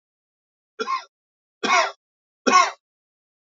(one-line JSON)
{"three_cough_length": "3.4 s", "three_cough_amplitude": 19781, "three_cough_signal_mean_std_ratio": 0.33, "survey_phase": "beta (2021-08-13 to 2022-03-07)", "age": "45-64", "gender": "Male", "wearing_mask": "No", "symptom_cough_any": true, "symptom_runny_or_blocked_nose": true, "symptom_shortness_of_breath": true, "symptom_sore_throat": true, "symptom_fatigue": true, "smoker_status": "Never smoked", "respiratory_condition_asthma": false, "respiratory_condition_other": false, "recruitment_source": "Test and Trace", "submission_delay": "3 days", "covid_test_result": "Positive", "covid_test_method": "RT-qPCR", "covid_ct_value": 28.2, "covid_ct_gene": "N gene"}